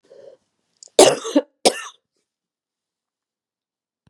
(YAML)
cough_length: 4.1 s
cough_amplitude: 32768
cough_signal_mean_std_ratio: 0.22
survey_phase: beta (2021-08-13 to 2022-03-07)
age: 45-64
gender: Female
wearing_mask: 'No'
symptom_cough_any: true
symptom_runny_or_blocked_nose: true
symptom_shortness_of_breath: true
symptom_abdominal_pain: true
symptom_diarrhoea: true
symptom_fatigue: true
symptom_headache: true
smoker_status: Never smoked
respiratory_condition_asthma: false
respiratory_condition_other: false
recruitment_source: Test and Trace
submission_delay: 2 days
covid_test_result: Positive
covid_test_method: RT-qPCR
covid_ct_value: 22.3
covid_ct_gene: ORF1ab gene